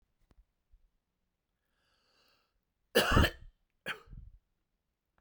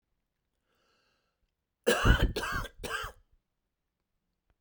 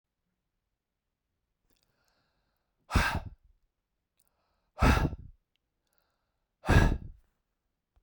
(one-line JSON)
{"cough_length": "5.2 s", "cough_amplitude": 8790, "cough_signal_mean_std_ratio": 0.23, "three_cough_length": "4.6 s", "three_cough_amplitude": 11938, "three_cough_signal_mean_std_ratio": 0.32, "exhalation_length": "8.0 s", "exhalation_amplitude": 11953, "exhalation_signal_mean_std_ratio": 0.26, "survey_phase": "beta (2021-08-13 to 2022-03-07)", "age": "18-44", "gender": "Male", "wearing_mask": "No", "symptom_none": true, "smoker_status": "Never smoked", "respiratory_condition_asthma": false, "respiratory_condition_other": false, "recruitment_source": "REACT", "submission_delay": "3 days", "covid_test_result": "Negative", "covid_test_method": "RT-qPCR"}